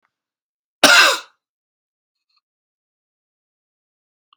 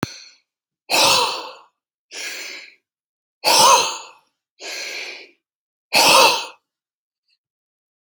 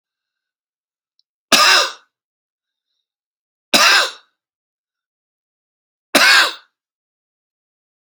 {
  "cough_length": "4.4 s",
  "cough_amplitude": 32768,
  "cough_signal_mean_std_ratio": 0.22,
  "exhalation_length": "8.1 s",
  "exhalation_amplitude": 32349,
  "exhalation_signal_mean_std_ratio": 0.38,
  "three_cough_length": "8.1 s",
  "three_cough_amplitude": 32768,
  "three_cough_signal_mean_std_ratio": 0.29,
  "survey_phase": "alpha (2021-03-01 to 2021-08-12)",
  "age": "45-64",
  "gender": "Male",
  "wearing_mask": "No",
  "symptom_fatigue": true,
  "smoker_status": "Never smoked",
  "respiratory_condition_asthma": true,
  "respiratory_condition_other": false,
  "recruitment_source": "REACT",
  "submission_delay": "5 days",
  "covid_test_result": "Negative",
  "covid_test_method": "RT-qPCR"
}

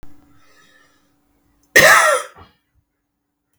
{
  "cough_length": "3.6 s",
  "cough_amplitude": 32768,
  "cough_signal_mean_std_ratio": 0.3,
  "survey_phase": "beta (2021-08-13 to 2022-03-07)",
  "age": "45-64",
  "gender": "Male",
  "wearing_mask": "No",
  "symptom_cough_any": true,
  "symptom_runny_or_blocked_nose": true,
  "symptom_change_to_sense_of_smell_or_taste": true,
  "symptom_onset": "3 days",
  "smoker_status": "Never smoked",
  "respiratory_condition_asthma": false,
  "respiratory_condition_other": false,
  "recruitment_source": "Test and Trace",
  "submission_delay": "2 days",
  "covid_test_result": "Positive",
  "covid_test_method": "ePCR"
}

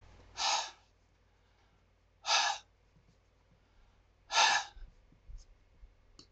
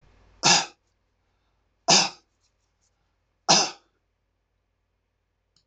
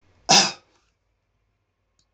{
  "exhalation_length": "6.3 s",
  "exhalation_amplitude": 6653,
  "exhalation_signal_mean_std_ratio": 0.33,
  "three_cough_length": "5.7 s",
  "three_cough_amplitude": 20641,
  "three_cough_signal_mean_std_ratio": 0.25,
  "cough_length": "2.1 s",
  "cough_amplitude": 25938,
  "cough_signal_mean_std_ratio": 0.24,
  "survey_phase": "beta (2021-08-13 to 2022-03-07)",
  "age": "65+",
  "gender": "Male",
  "wearing_mask": "No",
  "symptom_cough_any": true,
  "symptom_runny_or_blocked_nose": true,
  "symptom_onset": "3 days",
  "smoker_status": "Never smoked",
  "respiratory_condition_asthma": false,
  "respiratory_condition_other": false,
  "recruitment_source": "Test and Trace",
  "submission_delay": "2 days",
  "covid_test_result": "Positive",
  "covid_test_method": "RT-qPCR",
  "covid_ct_value": 23.3,
  "covid_ct_gene": "ORF1ab gene"
}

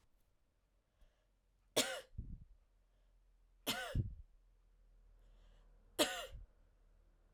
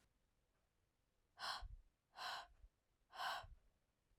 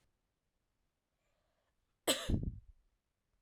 {
  "three_cough_length": "7.3 s",
  "three_cough_amplitude": 3340,
  "three_cough_signal_mean_std_ratio": 0.33,
  "exhalation_length": "4.2 s",
  "exhalation_amplitude": 632,
  "exhalation_signal_mean_std_ratio": 0.43,
  "cough_length": "3.4 s",
  "cough_amplitude": 4528,
  "cough_signal_mean_std_ratio": 0.26,
  "survey_phase": "alpha (2021-03-01 to 2021-08-12)",
  "age": "18-44",
  "gender": "Female",
  "wearing_mask": "No",
  "symptom_cough_any": true,
  "symptom_fatigue": true,
  "symptom_headache": true,
  "smoker_status": "Never smoked",
  "respiratory_condition_asthma": false,
  "respiratory_condition_other": false,
  "recruitment_source": "Test and Trace",
  "submission_delay": "2 days",
  "covid_test_result": "Positive",
  "covid_test_method": "RT-qPCR",
  "covid_ct_value": 22.0,
  "covid_ct_gene": "ORF1ab gene",
  "covid_ct_mean": 22.6,
  "covid_viral_load": "39000 copies/ml",
  "covid_viral_load_category": "Low viral load (10K-1M copies/ml)"
}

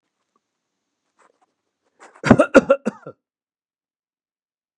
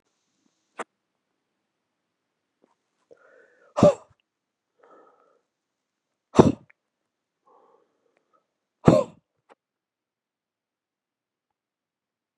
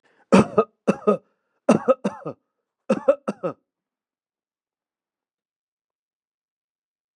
{
  "cough_length": "4.8 s",
  "cough_amplitude": 32768,
  "cough_signal_mean_std_ratio": 0.19,
  "exhalation_length": "12.4 s",
  "exhalation_amplitude": 32714,
  "exhalation_signal_mean_std_ratio": 0.14,
  "three_cough_length": "7.2 s",
  "three_cough_amplitude": 28316,
  "three_cough_signal_mean_std_ratio": 0.25,
  "survey_phase": "beta (2021-08-13 to 2022-03-07)",
  "age": "65+",
  "gender": "Male",
  "wearing_mask": "No",
  "symptom_none": true,
  "smoker_status": "Never smoked",
  "respiratory_condition_asthma": false,
  "respiratory_condition_other": false,
  "recruitment_source": "REACT",
  "submission_delay": "2 days",
  "covid_test_result": "Negative",
  "covid_test_method": "RT-qPCR",
  "influenza_a_test_result": "Negative",
  "influenza_b_test_result": "Negative"
}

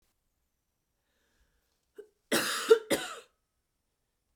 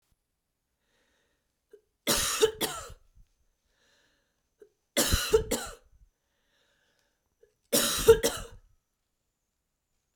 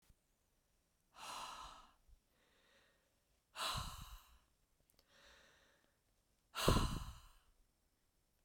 {
  "cough_length": "4.4 s",
  "cough_amplitude": 11686,
  "cough_signal_mean_std_ratio": 0.24,
  "three_cough_length": "10.2 s",
  "three_cough_amplitude": 15597,
  "three_cough_signal_mean_std_ratio": 0.29,
  "exhalation_length": "8.4 s",
  "exhalation_amplitude": 3988,
  "exhalation_signal_mean_std_ratio": 0.29,
  "survey_phase": "beta (2021-08-13 to 2022-03-07)",
  "age": "18-44",
  "gender": "Female",
  "wearing_mask": "No",
  "symptom_new_continuous_cough": true,
  "symptom_runny_or_blocked_nose": true,
  "symptom_fatigue": true,
  "symptom_headache": true,
  "symptom_other": true,
  "symptom_onset": "3 days",
  "smoker_status": "Never smoked",
  "respiratory_condition_asthma": false,
  "respiratory_condition_other": false,
  "recruitment_source": "Test and Trace",
  "submission_delay": "1 day",
  "covid_test_result": "Positive",
  "covid_test_method": "RT-qPCR"
}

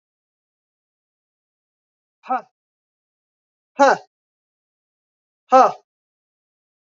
{
  "exhalation_length": "7.0 s",
  "exhalation_amplitude": 27198,
  "exhalation_signal_mean_std_ratio": 0.19,
  "survey_phase": "beta (2021-08-13 to 2022-03-07)",
  "age": "45-64",
  "gender": "Female",
  "wearing_mask": "No",
  "symptom_runny_or_blocked_nose": true,
  "symptom_onset": "3 days",
  "smoker_status": "Never smoked",
  "respiratory_condition_asthma": false,
  "respiratory_condition_other": false,
  "recruitment_source": "Test and Trace",
  "submission_delay": "1 day",
  "covid_test_result": "Positive",
  "covid_test_method": "RT-qPCR",
  "covid_ct_value": 18.6,
  "covid_ct_gene": "ORF1ab gene",
  "covid_ct_mean": 18.6,
  "covid_viral_load": "770000 copies/ml",
  "covid_viral_load_category": "Low viral load (10K-1M copies/ml)"
}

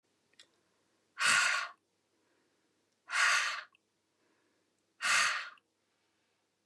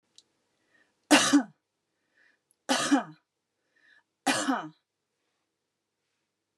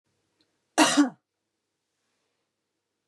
{
  "exhalation_length": "6.7 s",
  "exhalation_amplitude": 5786,
  "exhalation_signal_mean_std_ratio": 0.37,
  "three_cough_length": "6.6 s",
  "three_cough_amplitude": 16746,
  "three_cough_signal_mean_std_ratio": 0.29,
  "cough_length": "3.1 s",
  "cough_amplitude": 18116,
  "cough_signal_mean_std_ratio": 0.24,
  "survey_phase": "beta (2021-08-13 to 2022-03-07)",
  "age": "65+",
  "gender": "Female",
  "wearing_mask": "No",
  "symptom_none": true,
  "smoker_status": "Ex-smoker",
  "respiratory_condition_asthma": false,
  "respiratory_condition_other": false,
  "recruitment_source": "REACT",
  "submission_delay": "2 days",
  "covid_test_result": "Negative",
  "covid_test_method": "RT-qPCR",
  "influenza_a_test_result": "Negative",
  "influenza_b_test_result": "Negative"
}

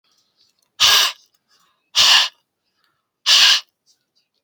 {
  "exhalation_length": "4.4 s",
  "exhalation_amplitude": 32767,
  "exhalation_signal_mean_std_ratio": 0.38,
  "survey_phase": "beta (2021-08-13 to 2022-03-07)",
  "age": "18-44",
  "gender": "Male",
  "wearing_mask": "No",
  "symptom_cough_any": true,
  "symptom_runny_or_blocked_nose": true,
  "symptom_headache": true,
  "symptom_other": true,
  "smoker_status": "Never smoked",
  "respiratory_condition_asthma": false,
  "respiratory_condition_other": false,
  "recruitment_source": "Test and Trace",
  "submission_delay": "0 days",
  "covid_test_result": "Positive",
  "covid_test_method": "LFT"
}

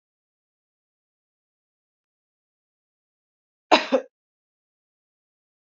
{
  "cough_length": "5.7 s",
  "cough_amplitude": 28850,
  "cough_signal_mean_std_ratio": 0.13,
  "survey_phase": "alpha (2021-03-01 to 2021-08-12)",
  "age": "45-64",
  "gender": "Female",
  "wearing_mask": "No",
  "symptom_fatigue": true,
  "symptom_headache": true,
  "smoker_status": "Never smoked",
  "respiratory_condition_asthma": false,
  "respiratory_condition_other": false,
  "recruitment_source": "Test and Trace",
  "submission_delay": "1 day",
  "covid_test_result": "Positive",
  "covid_test_method": "RT-qPCR",
  "covid_ct_value": 30.6,
  "covid_ct_gene": "ORF1ab gene",
  "covid_ct_mean": 31.4,
  "covid_viral_load": "52 copies/ml",
  "covid_viral_load_category": "Minimal viral load (< 10K copies/ml)"
}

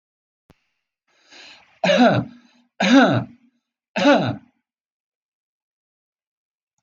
{
  "three_cough_length": "6.8 s",
  "three_cough_amplitude": 22826,
  "three_cough_signal_mean_std_ratio": 0.35,
  "survey_phase": "beta (2021-08-13 to 2022-03-07)",
  "age": "45-64",
  "gender": "Male",
  "wearing_mask": "No",
  "symptom_none": true,
  "smoker_status": "Never smoked",
  "respiratory_condition_asthma": false,
  "respiratory_condition_other": false,
  "recruitment_source": "REACT",
  "submission_delay": "0 days",
  "covid_test_result": "Negative",
  "covid_test_method": "RT-qPCR"
}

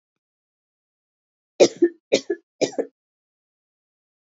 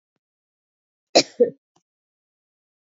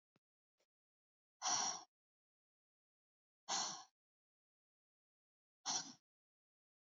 {
  "three_cough_length": "4.4 s",
  "three_cough_amplitude": 27193,
  "three_cough_signal_mean_std_ratio": 0.21,
  "cough_length": "3.0 s",
  "cough_amplitude": 27863,
  "cough_signal_mean_std_ratio": 0.17,
  "exhalation_length": "6.9 s",
  "exhalation_amplitude": 1528,
  "exhalation_signal_mean_std_ratio": 0.28,
  "survey_phase": "beta (2021-08-13 to 2022-03-07)",
  "age": "18-44",
  "gender": "Female",
  "wearing_mask": "No",
  "symptom_runny_or_blocked_nose": true,
  "symptom_shortness_of_breath": true,
  "symptom_fatigue": true,
  "symptom_headache": true,
  "smoker_status": "Never smoked",
  "respiratory_condition_asthma": false,
  "respiratory_condition_other": false,
  "recruitment_source": "Test and Trace",
  "submission_delay": "2 days",
  "covid_test_result": "Positive",
  "covid_test_method": "RT-qPCR"
}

